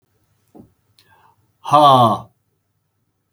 exhalation_length: 3.3 s
exhalation_amplitude: 32766
exhalation_signal_mean_std_ratio: 0.31
survey_phase: beta (2021-08-13 to 2022-03-07)
age: 45-64
gender: Male
wearing_mask: 'No'
symptom_none: true
smoker_status: Never smoked
respiratory_condition_asthma: false
respiratory_condition_other: false
recruitment_source: REACT
submission_delay: 1 day
covid_test_result: Negative
covid_test_method: RT-qPCR
influenza_a_test_result: Negative
influenza_b_test_result: Negative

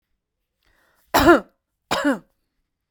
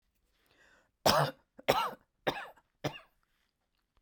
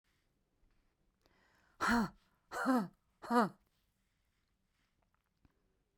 cough_length: 2.9 s
cough_amplitude: 30455
cough_signal_mean_std_ratio: 0.3
three_cough_length: 4.0 s
three_cough_amplitude: 11797
three_cough_signal_mean_std_ratio: 0.31
exhalation_length: 6.0 s
exhalation_amplitude: 4428
exhalation_signal_mean_std_ratio: 0.3
survey_phase: beta (2021-08-13 to 2022-03-07)
age: 45-64
gender: Female
wearing_mask: 'No'
symptom_none: true
smoker_status: Never smoked
respiratory_condition_asthma: true
respiratory_condition_other: false
recruitment_source: REACT
submission_delay: 3 days
covid_test_result: Negative
covid_test_method: RT-qPCR
influenza_a_test_result: Negative
influenza_b_test_result: Negative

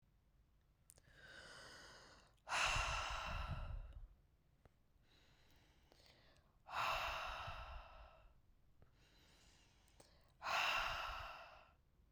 exhalation_length: 12.1 s
exhalation_amplitude: 1561
exhalation_signal_mean_std_ratio: 0.5
survey_phase: beta (2021-08-13 to 2022-03-07)
age: 18-44
gender: Female
wearing_mask: 'No'
symptom_cough_any: true
symptom_runny_or_blocked_nose: true
symptom_sore_throat: true
symptom_abdominal_pain: true
symptom_fatigue: true
symptom_headache: true
smoker_status: Never smoked
respiratory_condition_asthma: false
respiratory_condition_other: false
recruitment_source: Test and Trace
submission_delay: 2 days
covid_test_result: Positive
covid_test_method: RT-qPCR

